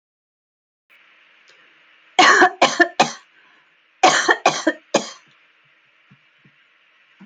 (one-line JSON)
{"cough_length": "7.3 s", "cough_amplitude": 29056, "cough_signal_mean_std_ratio": 0.32, "survey_phase": "alpha (2021-03-01 to 2021-08-12)", "age": "45-64", "gender": "Female", "wearing_mask": "No", "symptom_none": true, "smoker_status": "Never smoked", "respiratory_condition_asthma": false, "respiratory_condition_other": false, "recruitment_source": "REACT", "submission_delay": "1 day", "covid_test_result": "Negative", "covid_test_method": "RT-qPCR"}